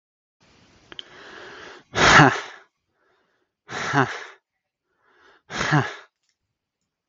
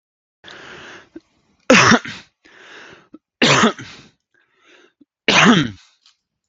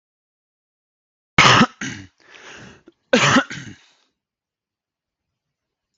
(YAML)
exhalation_length: 7.1 s
exhalation_amplitude: 32766
exhalation_signal_mean_std_ratio: 0.29
three_cough_length: 6.5 s
three_cough_amplitude: 32767
three_cough_signal_mean_std_ratio: 0.34
cough_length: 6.0 s
cough_amplitude: 32768
cough_signal_mean_std_ratio: 0.28
survey_phase: beta (2021-08-13 to 2022-03-07)
age: 18-44
gender: Male
wearing_mask: 'No'
symptom_abdominal_pain: true
symptom_diarrhoea: true
symptom_onset: 13 days
smoker_status: Ex-smoker
respiratory_condition_asthma: false
respiratory_condition_other: false
recruitment_source: REACT
submission_delay: 3 days
covid_test_result: Negative
covid_test_method: RT-qPCR